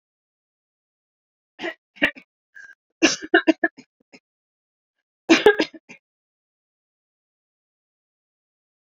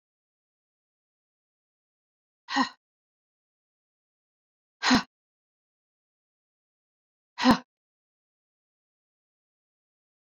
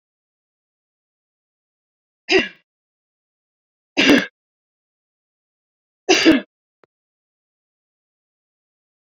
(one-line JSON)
{"cough_length": "8.9 s", "cough_amplitude": 31662, "cough_signal_mean_std_ratio": 0.21, "exhalation_length": "10.2 s", "exhalation_amplitude": 13094, "exhalation_signal_mean_std_ratio": 0.17, "three_cough_length": "9.1 s", "three_cough_amplitude": 28786, "three_cough_signal_mean_std_ratio": 0.22, "survey_phase": "beta (2021-08-13 to 2022-03-07)", "age": "45-64", "gender": "Female", "wearing_mask": "No", "symptom_none": true, "smoker_status": "Never smoked", "respiratory_condition_asthma": false, "respiratory_condition_other": false, "recruitment_source": "REACT", "submission_delay": "1 day", "covid_test_result": "Negative", "covid_test_method": "RT-qPCR"}